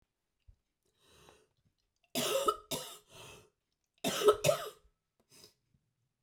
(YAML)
cough_length: 6.2 s
cough_amplitude: 8597
cough_signal_mean_std_ratio: 0.31
survey_phase: beta (2021-08-13 to 2022-03-07)
age: 45-64
gender: Female
wearing_mask: 'No'
symptom_cough_any: true
symptom_runny_or_blocked_nose: true
symptom_sore_throat: true
symptom_fatigue: true
symptom_headache: true
smoker_status: Never smoked
respiratory_condition_asthma: false
respiratory_condition_other: false
recruitment_source: Test and Trace
submission_delay: 2 days
covid_test_result: Positive
covid_test_method: LFT